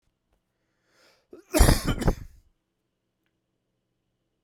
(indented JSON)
{
  "cough_length": "4.4 s",
  "cough_amplitude": 23745,
  "cough_signal_mean_std_ratio": 0.25,
  "survey_phase": "beta (2021-08-13 to 2022-03-07)",
  "age": "45-64",
  "gender": "Male",
  "wearing_mask": "No",
  "symptom_cough_any": true,
  "symptom_runny_or_blocked_nose": true,
  "symptom_sore_throat": true,
  "symptom_abdominal_pain": true,
  "symptom_fatigue": true,
  "symptom_headache": true,
  "smoker_status": "Ex-smoker",
  "respiratory_condition_asthma": false,
  "respiratory_condition_other": false,
  "recruitment_source": "Test and Trace",
  "submission_delay": "1 day",
  "covid_test_result": "Positive",
  "covid_test_method": "RT-qPCR",
  "covid_ct_value": 13.5,
  "covid_ct_gene": "S gene",
  "covid_ct_mean": 13.5,
  "covid_viral_load": "36000000 copies/ml",
  "covid_viral_load_category": "High viral load (>1M copies/ml)"
}